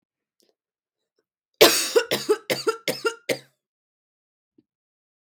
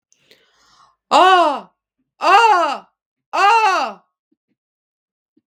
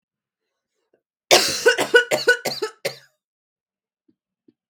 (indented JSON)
{
  "three_cough_length": "5.2 s",
  "three_cough_amplitude": 32766,
  "three_cough_signal_mean_std_ratio": 0.3,
  "exhalation_length": "5.5 s",
  "exhalation_amplitude": 32766,
  "exhalation_signal_mean_std_ratio": 0.44,
  "cough_length": "4.7 s",
  "cough_amplitude": 32766,
  "cough_signal_mean_std_ratio": 0.33,
  "survey_phase": "beta (2021-08-13 to 2022-03-07)",
  "age": "18-44",
  "gender": "Female",
  "wearing_mask": "No",
  "symptom_none": true,
  "smoker_status": "Current smoker (1 to 10 cigarettes per day)",
  "respiratory_condition_asthma": false,
  "respiratory_condition_other": false,
  "recruitment_source": "REACT",
  "submission_delay": "0 days",
  "covid_test_result": "Negative",
  "covid_test_method": "RT-qPCR",
  "influenza_a_test_result": "Negative",
  "influenza_b_test_result": "Negative"
}